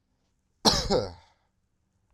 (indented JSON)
{
  "cough_length": "2.1 s",
  "cough_amplitude": 20295,
  "cough_signal_mean_std_ratio": 0.33,
  "survey_phase": "beta (2021-08-13 to 2022-03-07)",
  "age": "18-44",
  "gender": "Male",
  "wearing_mask": "No",
  "symptom_cough_any": true,
  "symptom_change_to_sense_of_smell_or_taste": true,
  "symptom_onset": "3 days",
  "smoker_status": "Never smoked",
  "respiratory_condition_asthma": false,
  "respiratory_condition_other": false,
  "recruitment_source": "Test and Trace",
  "submission_delay": "2 days",
  "covid_test_result": "Positive",
  "covid_test_method": "RT-qPCR",
  "covid_ct_value": 18.7,
  "covid_ct_gene": "ORF1ab gene",
  "covid_ct_mean": 19.5,
  "covid_viral_load": "390000 copies/ml",
  "covid_viral_load_category": "Low viral load (10K-1M copies/ml)"
}